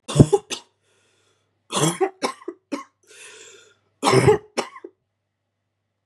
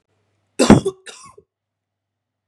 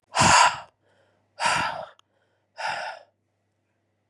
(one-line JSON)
{"three_cough_length": "6.1 s", "three_cough_amplitude": 32768, "three_cough_signal_mean_std_ratio": 0.31, "cough_length": "2.5 s", "cough_amplitude": 32768, "cough_signal_mean_std_ratio": 0.23, "exhalation_length": "4.1 s", "exhalation_amplitude": 21043, "exhalation_signal_mean_std_ratio": 0.38, "survey_phase": "beta (2021-08-13 to 2022-03-07)", "age": "18-44", "gender": "Female", "wearing_mask": "No", "symptom_cough_any": true, "symptom_new_continuous_cough": true, "symptom_runny_or_blocked_nose": true, "symptom_shortness_of_breath": true, "symptom_sore_throat": true, "symptom_fatigue": true, "symptom_headache": true, "symptom_change_to_sense_of_smell_or_taste": true, "symptom_loss_of_taste": true, "symptom_onset": "3 days", "smoker_status": "Ex-smoker", "respiratory_condition_asthma": false, "respiratory_condition_other": true, "recruitment_source": "Test and Trace", "submission_delay": "1 day", "covid_test_result": "Positive", "covid_test_method": "RT-qPCR"}